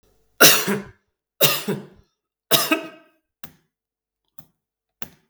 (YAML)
three_cough_length: 5.3 s
three_cough_amplitude: 32768
three_cough_signal_mean_std_ratio: 0.31
survey_phase: beta (2021-08-13 to 2022-03-07)
age: 65+
gender: Male
wearing_mask: 'No'
symptom_runny_or_blocked_nose: true
smoker_status: Ex-smoker
respiratory_condition_asthma: false
respiratory_condition_other: false
recruitment_source: REACT
submission_delay: 2 days
covid_test_result: Negative
covid_test_method: RT-qPCR
influenza_a_test_result: Negative
influenza_b_test_result: Negative